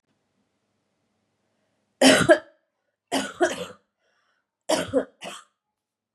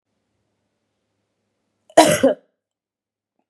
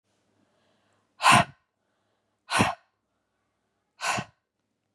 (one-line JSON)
{"three_cough_length": "6.1 s", "three_cough_amplitude": 26078, "three_cough_signal_mean_std_ratio": 0.29, "cough_length": "3.5 s", "cough_amplitude": 32768, "cough_signal_mean_std_ratio": 0.23, "exhalation_length": "4.9 s", "exhalation_amplitude": 17853, "exhalation_signal_mean_std_ratio": 0.26, "survey_phase": "beta (2021-08-13 to 2022-03-07)", "age": "18-44", "gender": "Female", "wearing_mask": "No", "symptom_cough_any": true, "symptom_runny_or_blocked_nose": true, "symptom_onset": "3 days", "smoker_status": "Ex-smoker", "respiratory_condition_asthma": false, "respiratory_condition_other": false, "recruitment_source": "Test and Trace", "submission_delay": "1 day", "covid_test_result": "Positive", "covid_test_method": "RT-qPCR", "covid_ct_value": 20.4, "covid_ct_gene": "ORF1ab gene", "covid_ct_mean": 20.8, "covid_viral_load": "150000 copies/ml", "covid_viral_load_category": "Low viral load (10K-1M copies/ml)"}